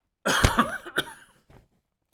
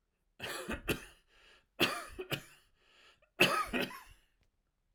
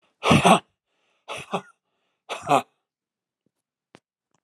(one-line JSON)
{"cough_length": "2.1 s", "cough_amplitude": 25746, "cough_signal_mean_std_ratio": 0.39, "three_cough_length": "4.9 s", "three_cough_amplitude": 8014, "three_cough_signal_mean_std_ratio": 0.38, "exhalation_length": "4.4 s", "exhalation_amplitude": 28055, "exhalation_signal_mean_std_ratio": 0.27, "survey_phase": "alpha (2021-03-01 to 2021-08-12)", "age": "65+", "gender": "Male", "wearing_mask": "No", "symptom_none": true, "smoker_status": "Never smoked", "respiratory_condition_asthma": false, "respiratory_condition_other": false, "recruitment_source": "REACT", "submission_delay": "3 days", "covid_test_result": "Negative", "covid_test_method": "RT-qPCR"}